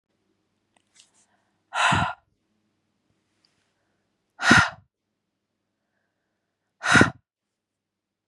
exhalation_length: 8.3 s
exhalation_amplitude: 31304
exhalation_signal_mean_std_ratio: 0.24
survey_phase: beta (2021-08-13 to 2022-03-07)
age: 45-64
gender: Female
wearing_mask: 'No'
symptom_none: true
smoker_status: Ex-smoker
respiratory_condition_asthma: false
respiratory_condition_other: false
recruitment_source: REACT
submission_delay: 2 days
covid_test_result: Negative
covid_test_method: RT-qPCR
influenza_a_test_result: Negative
influenza_b_test_result: Negative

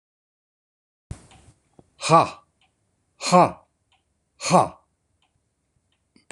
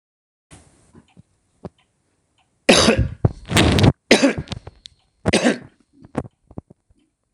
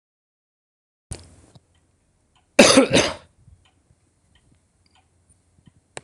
exhalation_length: 6.3 s
exhalation_amplitude: 25953
exhalation_signal_mean_std_ratio: 0.24
three_cough_length: 7.3 s
three_cough_amplitude: 26028
three_cough_signal_mean_std_ratio: 0.35
cough_length: 6.0 s
cough_amplitude: 26028
cough_signal_mean_std_ratio: 0.22
survey_phase: beta (2021-08-13 to 2022-03-07)
age: 65+
gender: Male
wearing_mask: 'No'
symptom_none: true
smoker_status: Never smoked
respiratory_condition_asthma: false
respiratory_condition_other: false
recruitment_source: Test and Trace
submission_delay: 1 day
covid_test_result: Negative
covid_test_method: LFT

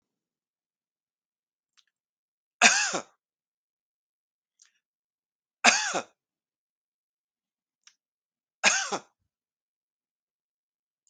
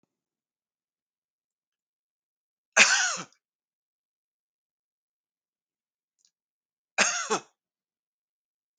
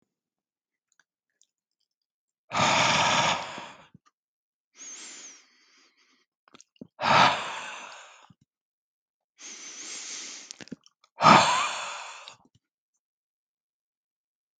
three_cough_length: 11.1 s
three_cough_amplitude: 24903
three_cough_signal_mean_std_ratio: 0.2
cough_length: 8.8 s
cough_amplitude: 22068
cough_signal_mean_std_ratio: 0.2
exhalation_length: 14.6 s
exhalation_amplitude: 22848
exhalation_signal_mean_std_ratio: 0.32
survey_phase: alpha (2021-03-01 to 2021-08-12)
age: 65+
gender: Male
wearing_mask: 'No'
symptom_none: true
smoker_status: Never smoked
respiratory_condition_asthma: false
respiratory_condition_other: false
recruitment_source: REACT
submission_delay: 2 days
covid_test_result: Negative
covid_test_method: RT-qPCR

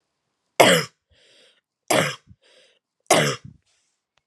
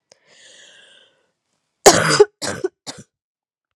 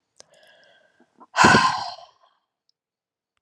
three_cough_length: 4.3 s
three_cough_amplitude: 32767
three_cough_signal_mean_std_ratio: 0.31
cough_length: 3.8 s
cough_amplitude: 32768
cough_signal_mean_std_ratio: 0.26
exhalation_length: 3.4 s
exhalation_amplitude: 28037
exhalation_signal_mean_std_ratio: 0.29
survey_phase: alpha (2021-03-01 to 2021-08-12)
age: 18-44
gender: Female
wearing_mask: 'No'
symptom_cough_any: true
symptom_fatigue: true
symptom_headache: true
symptom_onset: 3 days
smoker_status: Never smoked
respiratory_condition_asthma: false
respiratory_condition_other: false
recruitment_source: Test and Trace
submission_delay: 2 days
covid_test_result: Positive
covid_test_method: RT-qPCR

